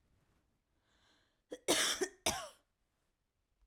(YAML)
cough_length: 3.7 s
cough_amplitude: 4062
cough_signal_mean_std_ratio: 0.31
survey_phase: alpha (2021-03-01 to 2021-08-12)
age: 18-44
gender: Female
wearing_mask: 'No'
symptom_diarrhoea: true
symptom_fatigue: true
symptom_headache: true
symptom_onset: 3 days
smoker_status: Current smoker (e-cigarettes or vapes only)
respiratory_condition_asthma: true
respiratory_condition_other: false
recruitment_source: REACT
submission_delay: 1 day
covid_test_result: Negative
covid_test_method: RT-qPCR